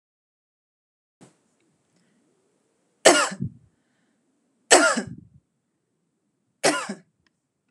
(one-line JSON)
{"three_cough_length": "7.7 s", "three_cough_amplitude": 32200, "three_cough_signal_mean_std_ratio": 0.24, "survey_phase": "beta (2021-08-13 to 2022-03-07)", "age": "45-64", "gender": "Female", "wearing_mask": "No", "symptom_none": true, "smoker_status": "Never smoked", "respiratory_condition_asthma": false, "respiratory_condition_other": false, "recruitment_source": "REACT", "submission_delay": "1 day", "covid_test_result": "Negative", "covid_test_method": "RT-qPCR"}